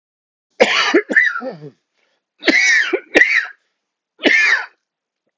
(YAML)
three_cough_length: 5.4 s
three_cough_amplitude: 32768
three_cough_signal_mean_std_ratio: 0.5
survey_phase: alpha (2021-03-01 to 2021-08-12)
age: 45-64
gender: Male
wearing_mask: 'No'
symptom_cough_any: true
symptom_shortness_of_breath: true
symptom_fatigue: true
symptom_fever_high_temperature: true
symptom_headache: true
symptom_onset: 5 days
smoker_status: Never smoked
respiratory_condition_asthma: false
respiratory_condition_other: false
recruitment_source: Test and Trace
submission_delay: 2 days
covid_test_result: Positive
covid_test_method: RT-qPCR